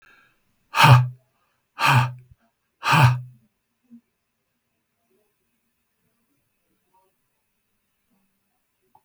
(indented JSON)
{
  "exhalation_length": "9.0 s",
  "exhalation_amplitude": 32701,
  "exhalation_signal_mean_std_ratio": 0.26,
  "survey_phase": "beta (2021-08-13 to 2022-03-07)",
  "age": "65+",
  "gender": "Male",
  "wearing_mask": "No",
  "symptom_none": true,
  "smoker_status": "Never smoked",
  "respiratory_condition_asthma": false,
  "respiratory_condition_other": false,
  "recruitment_source": "REACT",
  "submission_delay": "4 days",
  "covid_test_result": "Negative",
  "covid_test_method": "RT-qPCR"
}